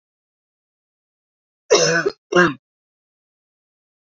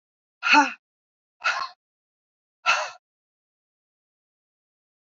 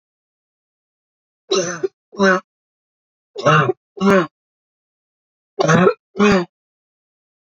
{"cough_length": "4.0 s", "cough_amplitude": 27748, "cough_signal_mean_std_ratio": 0.29, "exhalation_length": "5.1 s", "exhalation_amplitude": 20826, "exhalation_signal_mean_std_ratio": 0.26, "three_cough_length": "7.5 s", "three_cough_amplitude": 27806, "three_cough_signal_mean_std_ratio": 0.37, "survey_phase": "beta (2021-08-13 to 2022-03-07)", "age": "45-64", "gender": "Female", "wearing_mask": "No", "symptom_none": true, "smoker_status": "Never smoked", "respiratory_condition_asthma": false, "respiratory_condition_other": false, "recruitment_source": "REACT", "submission_delay": "1 day", "covid_test_result": "Negative", "covid_test_method": "RT-qPCR", "influenza_a_test_result": "Negative", "influenza_b_test_result": "Negative"}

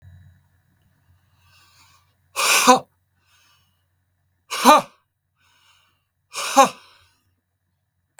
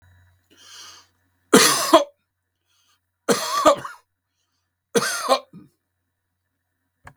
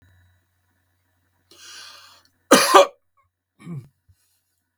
{"exhalation_length": "8.2 s", "exhalation_amplitude": 32768, "exhalation_signal_mean_std_ratio": 0.25, "three_cough_length": "7.2 s", "three_cough_amplitude": 32768, "three_cough_signal_mean_std_ratio": 0.31, "cough_length": "4.8 s", "cough_amplitude": 32768, "cough_signal_mean_std_ratio": 0.22, "survey_phase": "beta (2021-08-13 to 2022-03-07)", "age": "65+", "gender": "Male", "wearing_mask": "No", "symptom_runny_or_blocked_nose": true, "smoker_status": "Never smoked", "respiratory_condition_asthma": false, "respiratory_condition_other": false, "recruitment_source": "REACT", "submission_delay": "2 days", "covid_test_result": "Negative", "covid_test_method": "RT-qPCR", "influenza_a_test_result": "Unknown/Void", "influenza_b_test_result": "Unknown/Void"}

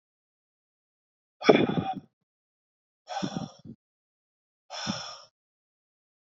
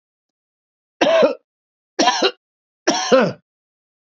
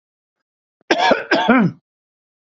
{"exhalation_length": "6.2 s", "exhalation_amplitude": 24009, "exhalation_signal_mean_std_ratio": 0.25, "three_cough_length": "4.2 s", "three_cough_amplitude": 27960, "three_cough_signal_mean_std_ratio": 0.4, "cough_length": "2.6 s", "cough_amplitude": 29321, "cough_signal_mean_std_ratio": 0.43, "survey_phase": "beta (2021-08-13 to 2022-03-07)", "age": "45-64", "gender": "Male", "wearing_mask": "No", "symptom_none": true, "smoker_status": "Never smoked", "respiratory_condition_asthma": false, "respiratory_condition_other": false, "recruitment_source": "REACT", "submission_delay": "5 days", "covid_test_result": "Negative", "covid_test_method": "RT-qPCR", "influenza_a_test_result": "Negative", "influenza_b_test_result": "Negative"}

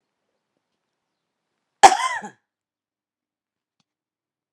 {"cough_length": "4.5 s", "cough_amplitude": 32768, "cough_signal_mean_std_ratio": 0.15, "survey_phase": "alpha (2021-03-01 to 2021-08-12)", "age": "45-64", "gender": "Female", "wearing_mask": "No", "symptom_none": true, "smoker_status": "Ex-smoker", "respiratory_condition_asthma": false, "respiratory_condition_other": false, "recruitment_source": "REACT", "submission_delay": "1 day", "covid_test_result": "Negative", "covid_test_method": "RT-qPCR"}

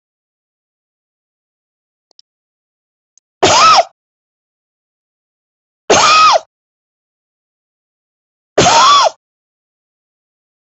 {"three_cough_length": "10.8 s", "three_cough_amplitude": 32375, "three_cough_signal_mean_std_ratio": 0.32, "survey_phase": "alpha (2021-03-01 to 2021-08-12)", "age": "45-64", "gender": "Female", "wearing_mask": "No", "symptom_cough_any": true, "symptom_fatigue": true, "symptom_onset": "12 days", "smoker_status": "Never smoked", "respiratory_condition_asthma": true, "respiratory_condition_other": false, "recruitment_source": "REACT", "submission_delay": "3 days", "covid_test_result": "Negative", "covid_test_method": "RT-qPCR"}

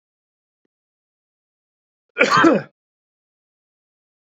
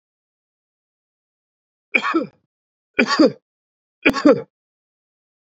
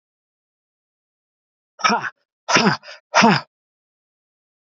{"cough_length": "4.3 s", "cough_amplitude": 32768, "cough_signal_mean_std_ratio": 0.24, "three_cough_length": "5.5 s", "three_cough_amplitude": 28857, "three_cough_signal_mean_std_ratio": 0.28, "exhalation_length": "4.6 s", "exhalation_amplitude": 31430, "exhalation_signal_mean_std_ratio": 0.31, "survey_phase": "beta (2021-08-13 to 2022-03-07)", "age": "45-64", "gender": "Male", "wearing_mask": "No", "symptom_none": true, "smoker_status": "Ex-smoker", "respiratory_condition_asthma": false, "respiratory_condition_other": false, "recruitment_source": "REACT", "submission_delay": "0 days", "covid_test_result": "Negative", "covid_test_method": "RT-qPCR"}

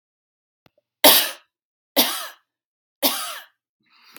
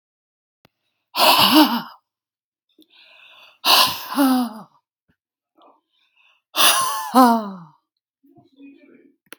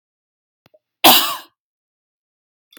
{"three_cough_length": "4.2 s", "three_cough_amplitude": 32768, "three_cough_signal_mean_std_ratio": 0.29, "exhalation_length": "9.4 s", "exhalation_amplitude": 32768, "exhalation_signal_mean_std_ratio": 0.38, "cough_length": "2.8 s", "cough_amplitude": 32767, "cough_signal_mean_std_ratio": 0.24, "survey_phase": "beta (2021-08-13 to 2022-03-07)", "age": "45-64", "gender": "Female", "wearing_mask": "No", "symptom_runny_or_blocked_nose": true, "symptom_onset": "12 days", "smoker_status": "Ex-smoker", "respiratory_condition_asthma": false, "respiratory_condition_other": false, "recruitment_source": "REACT", "submission_delay": "1 day", "covid_test_result": "Negative", "covid_test_method": "RT-qPCR", "influenza_a_test_result": "Negative", "influenza_b_test_result": "Negative"}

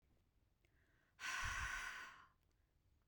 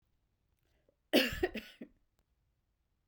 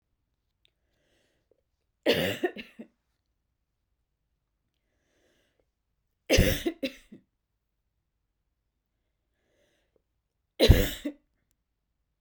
{"exhalation_length": "3.1 s", "exhalation_amplitude": 827, "exhalation_signal_mean_std_ratio": 0.49, "cough_length": "3.1 s", "cough_amplitude": 8499, "cough_signal_mean_std_ratio": 0.25, "three_cough_length": "12.2 s", "three_cough_amplitude": 23586, "three_cough_signal_mean_std_ratio": 0.22, "survey_phase": "beta (2021-08-13 to 2022-03-07)", "age": "18-44", "gender": "Female", "wearing_mask": "No", "symptom_runny_or_blocked_nose": true, "symptom_onset": "12 days", "smoker_status": "Never smoked", "respiratory_condition_asthma": false, "respiratory_condition_other": false, "recruitment_source": "REACT", "submission_delay": "2 days", "covid_test_result": "Negative", "covid_test_method": "RT-qPCR", "influenza_a_test_result": "Negative", "influenza_b_test_result": "Negative"}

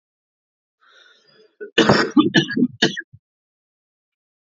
{"cough_length": "4.4 s", "cough_amplitude": 32767, "cough_signal_mean_std_ratio": 0.34, "survey_phase": "alpha (2021-03-01 to 2021-08-12)", "age": "18-44", "gender": "Male", "wearing_mask": "No", "symptom_cough_any": true, "symptom_headache": true, "symptom_onset": "4 days", "smoker_status": "Never smoked", "respiratory_condition_asthma": true, "respiratory_condition_other": false, "recruitment_source": "Test and Trace", "submission_delay": "2 days", "covid_test_result": "Positive", "covid_test_method": "RT-qPCR", "covid_ct_value": 12.7, "covid_ct_gene": "ORF1ab gene"}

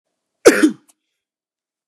{"cough_length": "1.9 s", "cough_amplitude": 32768, "cough_signal_mean_std_ratio": 0.26, "survey_phase": "beta (2021-08-13 to 2022-03-07)", "age": "45-64", "gender": "Male", "wearing_mask": "No", "symptom_abdominal_pain": true, "smoker_status": "Ex-smoker", "respiratory_condition_asthma": false, "respiratory_condition_other": false, "recruitment_source": "REACT", "submission_delay": "1 day", "covid_test_result": "Negative", "covid_test_method": "RT-qPCR"}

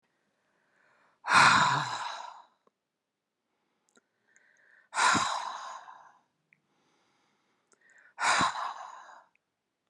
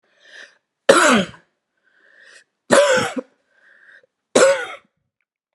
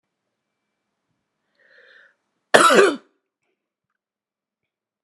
{"exhalation_length": "9.9 s", "exhalation_amplitude": 12612, "exhalation_signal_mean_std_ratio": 0.34, "three_cough_length": "5.5 s", "three_cough_amplitude": 32768, "three_cough_signal_mean_std_ratio": 0.36, "cough_length": "5.0 s", "cough_amplitude": 32768, "cough_signal_mean_std_ratio": 0.22, "survey_phase": "alpha (2021-03-01 to 2021-08-12)", "age": "65+", "gender": "Female", "wearing_mask": "No", "symptom_none": true, "smoker_status": "Never smoked", "respiratory_condition_asthma": false, "respiratory_condition_other": false, "recruitment_source": "REACT", "submission_delay": "1 day", "covid_test_result": "Negative", "covid_test_method": "RT-qPCR"}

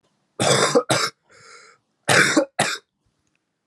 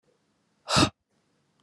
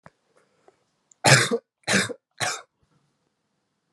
{"cough_length": "3.7 s", "cough_amplitude": 30098, "cough_signal_mean_std_ratio": 0.45, "exhalation_length": "1.6 s", "exhalation_amplitude": 13565, "exhalation_signal_mean_std_ratio": 0.27, "three_cough_length": "3.9 s", "three_cough_amplitude": 29222, "three_cough_signal_mean_std_ratio": 0.3, "survey_phase": "alpha (2021-03-01 to 2021-08-12)", "age": "18-44", "gender": "Male", "wearing_mask": "No", "symptom_cough_any": true, "symptom_fatigue": true, "symptom_fever_high_temperature": true, "symptom_headache": true, "symptom_change_to_sense_of_smell_or_taste": true, "smoker_status": "Never smoked", "respiratory_condition_asthma": false, "respiratory_condition_other": false, "recruitment_source": "Test and Trace", "submission_delay": "2 days", "covid_test_result": "Positive", "covid_test_method": "RT-qPCR"}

